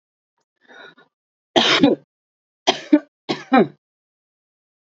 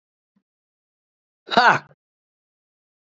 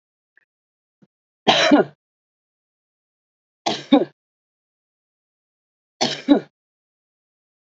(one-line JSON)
{"cough_length": "4.9 s", "cough_amplitude": 28965, "cough_signal_mean_std_ratio": 0.3, "exhalation_length": "3.1 s", "exhalation_amplitude": 27791, "exhalation_signal_mean_std_ratio": 0.21, "three_cough_length": "7.7 s", "three_cough_amplitude": 29727, "three_cough_signal_mean_std_ratio": 0.25, "survey_phase": "alpha (2021-03-01 to 2021-08-12)", "age": "18-44", "wearing_mask": "No", "symptom_cough_any": true, "symptom_fatigue": true, "symptom_headache": true, "smoker_status": "Ex-smoker", "respiratory_condition_asthma": false, "respiratory_condition_other": false, "recruitment_source": "Test and Trace", "submission_delay": "2 days", "covid_test_result": "Positive", "covid_test_method": "RT-qPCR", "covid_ct_value": 28.3, "covid_ct_gene": "ORF1ab gene"}